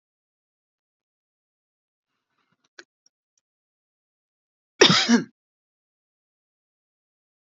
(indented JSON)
{
  "cough_length": "7.5 s",
  "cough_amplitude": 27904,
  "cough_signal_mean_std_ratio": 0.17,
  "survey_phase": "beta (2021-08-13 to 2022-03-07)",
  "age": "45-64",
  "gender": "Female",
  "wearing_mask": "No",
  "symptom_fatigue": true,
  "smoker_status": "Never smoked",
  "respiratory_condition_asthma": true,
  "respiratory_condition_other": false,
  "recruitment_source": "REACT",
  "submission_delay": "4 days",
  "covid_test_result": "Negative",
  "covid_test_method": "RT-qPCR",
  "influenza_a_test_result": "Negative",
  "influenza_b_test_result": "Negative"
}